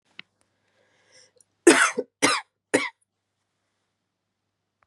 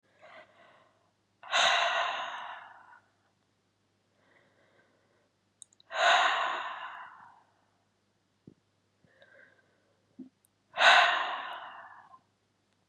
{"cough_length": "4.9 s", "cough_amplitude": 30907, "cough_signal_mean_std_ratio": 0.24, "exhalation_length": "12.9 s", "exhalation_amplitude": 14602, "exhalation_signal_mean_std_ratio": 0.34, "survey_phase": "beta (2021-08-13 to 2022-03-07)", "age": "18-44", "gender": "Female", "wearing_mask": "No", "symptom_cough_any": true, "symptom_runny_or_blocked_nose": true, "symptom_sore_throat": true, "symptom_headache": true, "smoker_status": "Current smoker (e-cigarettes or vapes only)", "respiratory_condition_asthma": false, "respiratory_condition_other": false, "recruitment_source": "Test and Trace", "submission_delay": "1 day", "covid_test_result": "Positive", "covid_test_method": "RT-qPCR", "covid_ct_value": 26.9, "covid_ct_gene": "ORF1ab gene", "covid_ct_mean": 27.6, "covid_viral_load": "890 copies/ml", "covid_viral_load_category": "Minimal viral load (< 10K copies/ml)"}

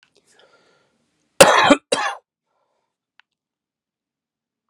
{"cough_length": "4.7 s", "cough_amplitude": 32768, "cough_signal_mean_std_ratio": 0.23, "survey_phase": "beta (2021-08-13 to 2022-03-07)", "age": "45-64", "gender": "Male", "wearing_mask": "No", "symptom_cough_any": true, "symptom_runny_or_blocked_nose": true, "smoker_status": "Never smoked", "respiratory_condition_asthma": false, "respiratory_condition_other": false, "recruitment_source": "Test and Trace", "submission_delay": "1 day", "covid_test_result": "Positive", "covid_test_method": "RT-qPCR", "covid_ct_value": 15.7, "covid_ct_gene": "ORF1ab gene"}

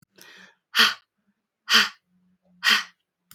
{"exhalation_length": "3.3 s", "exhalation_amplitude": 22014, "exhalation_signal_mean_std_ratio": 0.32, "survey_phase": "beta (2021-08-13 to 2022-03-07)", "age": "18-44", "gender": "Female", "wearing_mask": "No", "symptom_sore_throat": true, "smoker_status": "Never smoked", "respiratory_condition_asthma": false, "respiratory_condition_other": false, "recruitment_source": "REACT", "submission_delay": "1 day", "covid_test_result": "Negative", "covid_test_method": "RT-qPCR"}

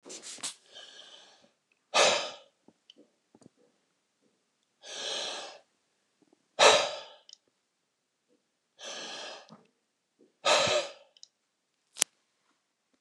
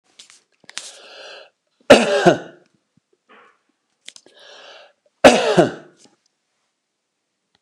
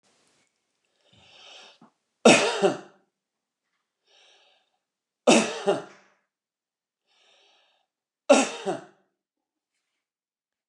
{"exhalation_length": "13.0 s", "exhalation_amplitude": 29204, "exhalation_signal_mean_std_ratio": 0.28, "cough_length": "7.6 s", "cough_amplitude": 29204, "cough_signal_mean_std_ratio": 0.26, "three_cough_length": "10.7 s", "three_cough_amplitude": 23055, "three_cough_signal_mean_std_ratio": 0.24, "survey_phase": "beta (2021-08-13 to 2022-03-07)", "age": "65+", "gender": "Male", "wearing_mask": "No", "symptom_none": true, "smoker_status": "Ex-smoker", "respiratory_condition_asthma": false, "respiratory_condition_other": false, "recruitment_source": "REACT", "submission_delay": "2 days", "covid_test_result": "Negative", "covid_test_method": "RT-qPCR", "influenza_a_test_result": "Negative", "influenza_b_test_result": "Negative"}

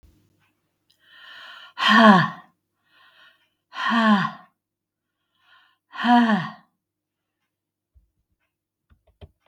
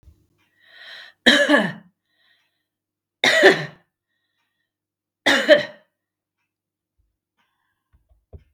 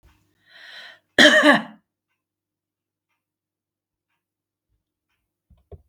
{"exhalation_length": "9.5 s", "exhalation_amplitude": 32565, "exhalation_signal_mean_std_ratio": 0.31, "three_cough_length": "8.5 s", "three_cough_amplitude": 32768, "three_cough_signal_mean_std_ratio": 0.28, "cough_length": "5.9 s", "cough_amplitude": 32768, "cough_signal_mean_std_ratio": 0.22, "survey_phase": "beta (2021-08-13 to 2022-03-07)", "age": "65+", "gender": "Female", "wearing_mask": "No", "symptom_none": true, "smoker_status": "Never smoked", "respiratory_condition_asthma": false, "respiratory_condition_other": false, "recruitment_source": "REACT", "submission_delay": "13 days", "covid_test_result": "Negative", "covid_test_method": "RT-qPCR", "influenza_a_test_result": "Negative", "influenza_b_test_result": "Negative"}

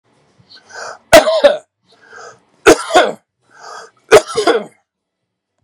{"three_cough_length": "5.6 s", "three_cough_amplitude": 32768, "three_cough_signal_mean_std_ratio": 0.35, "survey_phase": "beta (2021-08-13 to 2022-03-07)", "age": "65+", "gender": "Male", "wearing_mask": "No", "symptom_none": true, "smoker_status": "Never smoked", "respiratory_condition_asthma": false, "respiratory_condition_other": false, "recruitment_source": "REACT", "submission_delay": "3 days", "covid_test_result": "Negative", "covid_test_method": "RT-qPCR", "influenza_a_test_result": "Negative", "influenza_b_test_result": "Negative"}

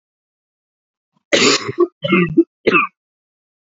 {"three_cough_length": "3.7 s", "three_cough_amplitude": 30865, "three_cough_signal_mean_std_ratio": 0.4, "survey_phase": "beta (2021-08-13 to 2022-03-07)", "age": "18-44", "gender": "Female", "wearing_mask": "No", "symptom_cough_any": true, "symptom_new_continuous_cough": true, "symptom_runny_or_blocked_nose": true, "symptom_sore_throat": true, "symptom_fatigue": true, "symptom_fever_high_temperature": true, "symptom_headache": true, "symptom_change_to_sense_of_smell_or_taste": true, "symptom_loss_of_taste": true, "symptom_onset": "6 days", "smoker_status": "Never smoked", "respiratory_condition_asthma": false, "respiratory_condition_other": false, "recruitment_source": "Test and Trace", "submission_delay": "2 days", "covid_test_result": "Positive", "covid_test_method": "RT-qPCR", "covid_ct_value": 24.8, "covid_ct_gene": "ORF1ab gene"}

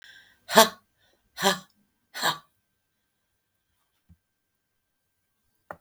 {"exhalation_length": "5.8 s", "exhalation_amplitude": 32768, "exhalation_signal_mean_std_ratio": 0.19, "survey_phase": "beta (2021-08-13 to 2022-03-07)", "age": "65+", "gender": "Female", "wearing_mask": "No", "symptom_none": true, "smoker_status": "Never smoked", "respiratory_condition_asthma": false, "respiratory_condition_other": false, "recruitment_source": "REACT", "submission_delay": "2 days", "covid_test_result": "Negative", "covid_test_method": "RT-qPCR", "influenza_a_test_result": "Negative", "influenza_b_test_result": "Negative"}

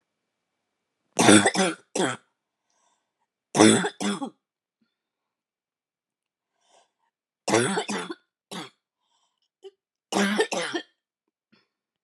{"three_cough_length": "12.0 s", "three_cough_amplitude": 27964, "three_cough_signal_mean_std_ratio": 0.31, "survey_phase": "beta (2021-08-13 to 2022-03-07)", "age": "18-44", "gender": "Female", "wearing_mask": "No", "symptom_cough_any": true, "symptom_runny_or_blocked_nose": true, "symptom_abdominal_pain": true, "symptom_headache": true, "symptom_onset": "3 days", "smoker_status": "Current smoker (1 to 10 cigarettes per day)", "respiratory_condition_asthma": false, "respiratory_condition_other": false, "recruitment_source": "Test and Trace", "submission_delay": "2 days", "covid_test_result": "Positive", "covid_test_method": "RT-qPCR", "covid_ct_value": 31.9, "covid_ct_gene": "ORF1ab gene"}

